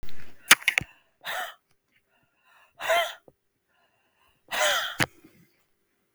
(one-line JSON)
{"exhalation_length": "6.1 s", "exhalation_amplitude": 32766, "exhalation_signal_mean_std_ratio": 0.34, "survey_phase": "beta (2021-08-13 to 2022-03-07)", "age": "65+", "gender": "Female", "wearing_mask": "No", "symptom_none": true, "smoker_status": "Never smoked", "respiratory_condition_asthma": true, "respiratory_condition_other": false, "recruitment_source": "REACT", "submission_delay": "6 days", "covid_test_result": "Negative", "covid_test_method": "RT-qPCR"}